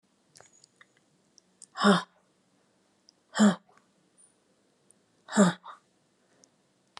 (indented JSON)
{
  "exhalation_length": "7.0 s",
  "exhalation_amplitude": 15748,
  "exhalation_signal_mean_std_ratio": 0.23,
  "survey_phase": "alpha (2021-03-01 to 2021-08-12)",
  "age": "45-64",
  "gender": "Female",
  "wearing_mask": "No",
  "symptom_none": true,
  "smoker_status": "Never smoked",
  "respiratory_condition_asthma": false,
  "respiratory_condition_other": false,
  "recruitment_source": "REACT",
  "submission_delay": "1 day",
  "covid_test_result": "Negative",
  "covid_test_method": "RT-qPCR"
}